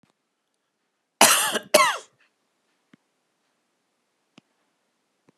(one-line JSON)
{"cough_length": "5.4 s", "cough_amplitude": 30958, "cough_signal_mean_std_ratio": 0.24, "survey_phase": "beta (2021-08-13 to 2022-03-07)", "age": "45-64", "gender": "Male", "wearing_mask": "No", "symptom_none": true, "smoker_status": "Never smoked", "respiratory_condition_asthma": false, "respiratory_condition_other": false, "recruitment_source": "REACT", "submission_delay": "1 day", "covid_test_result": "Negative", "covid_test_method": "RT-qPCR"}